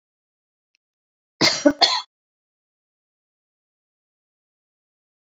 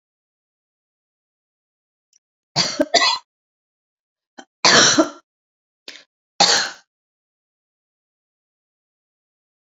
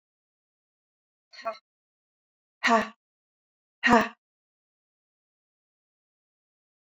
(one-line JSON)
{"cough_length": "5.3 s", "cough_amplitude": 29490, "cough_signal_mean_std_ratio": 0.21, "three_cough_length": "9.6 s", "three_cough_amplitude": 32563, "three_cough_signal_mean_std_ratio": 0.27, "exhalation_length": "6.8 s", "exhalation_amplitude": 13984, "exhalation_signal_mean_std_ratio": 0.2, "survey_phase": "beta (2021-08-13 to 2022-03-07)", "age": "45-64", "gender": "Female", "wearing_mask": "No", "symptom_none": true, "smoker_status": "Never smoked", "respiratory_condition_asthma": false, "respiratory_condition_other": false, "recruitment_source": "REACT", "submission_delay": "2 days", "covid_test_result": "Negative", "covid_test_method": "RT-qPCR"}